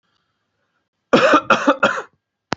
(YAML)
cough_length: 2.6 s
cough_amplitude: 32607
cough_signal_mean_std_ratio: 0.4
survey_phase: beta (2021-08-13 to 2022-03-07)
age: 18-44
gender: Male
wearing_mask: 'No'
symptom_none: true
smoker_status: Never smoked
respiratory_condition_asthma: false
respiratory_condition_other: false
recruitment_source: REACT
submission_delay: 3 days
covid_test_result: Negative
covid_test_method: RT-qPCR
influenza_a_test_result: Negative
influenza_b_test_result: Negative